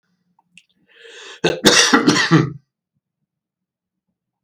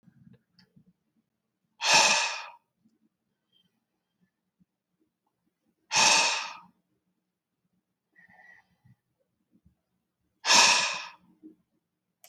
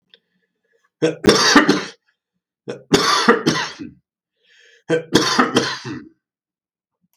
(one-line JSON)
{"cough_length": "4.4 s", "cough_amplitude": 32768, "cough_signal_mean_std_ratio": 0.37, "exhalation_length": "12.3 s", "exhalation_amplitude": 18862, "exhalation_signal_mean_std_ratio": 0.28, "three_cough_length": "7.2 s", "three_cough_amplitude": 32768, "three_cough_signal_mean_std_ratio": 0.43, "survey_phase": "beta (2021-08-13 to 2022-03-07)", "age": "65+", "gender": "Male", "wearing_mask": "No", "symptom_fatigue": true, "symptom_change_to_sense_of_smell_or_taste": true, "symptom_onset": "3 days", "smoker_status": "Never smoked", "respiratory_condition_asthma": true, "respiratory_condition_other": false, "recruitment_source": "REACT", "submission_delay": "7 days", "covid_test_result": "Negative", "covid_test_method": "RT-qPCR", "influenza_a_test_result": "Negative", "influenza_b_test_result": "Negative"}